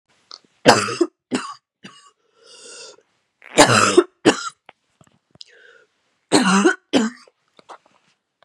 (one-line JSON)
{"three_cough_length": "8.4 s", "three_cough_amplitude": 32768, "three_cough_signal_mean_std_ratio": 0.34, "survey_phase": "beta (2021-08-13 to 2022-03-07)", "age": "18-44", "gender": "Female", "wearing_mask": "No", "symptom_new_continuous_cough": true, "symptom_runny_or_blocked_nose": true, "symptom_sore_throat": true, "symptom_fatigue": true, "symptom_headache": true, "symptom_onset": "4 days", "smoker_status": "Never smoked", "respiratory_condition_asthma": false, "respiratory_condition_other": true, "recruitment_source": "Test and Trace", "submission_delay": "2 days", "covid_test_result": "Positive", "covid_test_method": "RT-qPCR", "covid_ct_value": 21.4, "covid_ct_gene": "ORF1ab gene", "covid_ct_mean": 21.8, "covid_viral_load": "71000 copies/ml", "covid_viral_load_category": "Low viral load (10K-1M copies/ml)"}